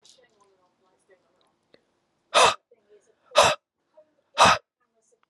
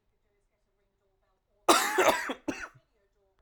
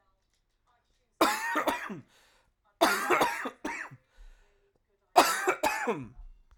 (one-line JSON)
{"exhalation_length": "5.3 s", "exhalation_amplitude": 24269, "exhalation_signal_mean_std_ratio": 0.26, "cough_length": "3.4 s", "cough_amplitude": 15405, "cough_signal_mean_std_ratio": 0.33, "three_cough_length": "6.6 s", "three_cough_amplitude": 17525, "three_cough_signal_mean_std_ratio": 0.44, "survey_phase": "alpha (2021-03-01 to 2021-08-12)", "age": "18-44", "gender": "Male", "wearing_mask": "No", "symptom_cough_any": true, "symptom_new_continuous_cough": true, "symptom_onset": "3 days", "smoker_status": "Never smoked", "respiratory_condition_asthma": false, "respiratory_condition_other": false, "recruitment_source": "Test and Trace", "submission_delay": "1 day", "covid_test_result": "Positive", "covid_test_method": "RT-qPCR"}